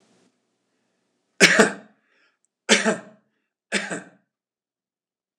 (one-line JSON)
{"three_cough_length": "5.4 s", "three_cough_amplitude": 26028, "three_cough_signal_mean_std_ratio": 0.26, "survey_phase": "beta (2021-08-13 to 2022-03-07)", "age": "65+", "gender": "Male", "wearing_mask": "No", "symptom_none": true, "smoker_status": "Ex-smoker", "respiratory_condition_asthma": false, "respiratory_condition_other": false, "recruitment_source": "REACT", "submission_delay": "0 days", "covid_test_result": "Negative", "covid_test_method": "RT-qPCR", "influenza_a_test_result": "Unknown/Void", "influenza_b_test_result": "Unknown/Void"}